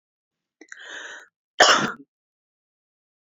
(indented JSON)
{
  "cough_length": "3.3 s",
  "cough_amplitude": 27961,
  "cough_signal_mean_std_ratio": 0.25,
  "survey_phase": "alpha (2021-03-01 to 2021-08-12)",
  "age": "45-64",
  "gender": "Female",
  "wearing_mask": "No",
  "symptom_none": true,
  "smoker_status": "Ex-smoker",
  "respiratory_condition_asthma": false,
  "respiratory_condition_other": false,
  "recruitment_source": "REACT",
  "submission_delay": "2 days",
  "covid_test_result": "Negative",
  "covid_test_method": "RT-qPCR"
}